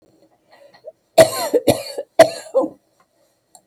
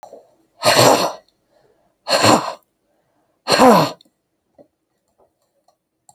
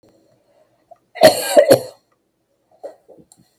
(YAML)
three_cough_length: 3.7 s
three_cough_amplitude: 32768
three_cough_signal_mean_std_ratio: 0.32
exhalation_length: 6.1 s
exhalation_amplitude: 32768
exhalation_signal_mean_std_ratio: 0.36
cough_length: 3.6 s
cough_amplitude: 32768
cough_signal_mean_std_ratio: 0.28
survey_phase: beta (2021-08-13 to 2022-03-07)
age: 65+
gender: Female
wearing_mask: 'No'
symptom_cough_any: true
symptom_runny_or_blocked_nose: true
symptom_sore_throat: true
symptom_abdominal_pain: true
symptom_fatigue: true
symptom_headache: true
symptom_onset: 12 days
smoker_status: Ex-smoker
respiratory_condition_asthma: false
respiratory_condition_other: false
recruitment_source: REACT
submission_delay: 2 days
covid_test_result: Negative
covid_test_method: RT-qPCR
influenza_a_test_result: Negative
influenza_b_test_result: Negative